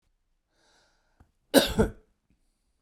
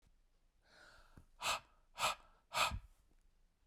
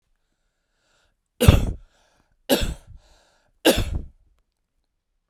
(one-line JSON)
{"cough_length": "2.8 s", "cough_amplitude": 22544, "cough_signal_mean_std_ratio": 0.23, "exhalation_length": "3.7 s", "exhalation_amplitude": 2934, "exhalation_signal_mean_std_ratio": 0.36, "three_cough_length": "5.3 s", "three_cough_amplitude": 32768, "three_cough_signal_mean_std_ratio": 0.28, "survey_phase": "alpha (2021-03-01 to 2021-08-12)", "age": "45-64", "gender": "Male", "wearing_mask": "No", "symptom_cough_any": true, "symptom_fever_high_temperature": true, "smoker_status": "Never smoked", "respiratory_condition_asthma": false, "respiratory_condition_other": false, "recruitment_source": "Test and Trace", "submission_delay": "3 days", "covid_test_result": "Positive", "covid_test_method": "RT-qPCR", "covid_ct_value": 22.1, "covid_ct_gene": "S gene", "covid_ct_mean": 23.0, "covid_viral_load": "28000 copies/ml", "covid_viral_load_category": "Low viral load (10K-1M copies/ml)"}